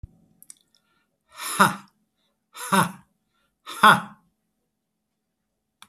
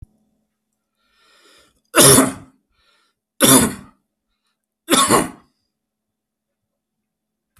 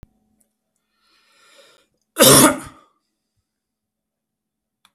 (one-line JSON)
{"exhalation_length": "5.9 s", "exhalation_amplitude": 27918, "exhalation_signal_mean_std_ratio": 0.24, "three_cough_length": "7.6 s", "three_cough_amplitude": 32768, "three_cough_signal_mean_std_ratio": 0.29, "cough_length": "4.9 s", "cough_amplitude": 32768, "cough_signal_mean_std_ratio": 0.22, "survey_phase": "beta (2021-08-13 to 2022-03-07)", "age": "45-64", "gender": "Male", "wearing_mask": "No", "symptom_none": true, "smoker_status": "Never smoked", "respiratory_condition_asthma": false, "respiratory_condition_other": false, "recruitment_source": "REACT", "submission_delay": "3 days", "covid_test_result": "Negative", "covid_test_method": "RT-qPCR", "influenza_a_test_result": "Negative", "influenza_b_test_result": "Negative"}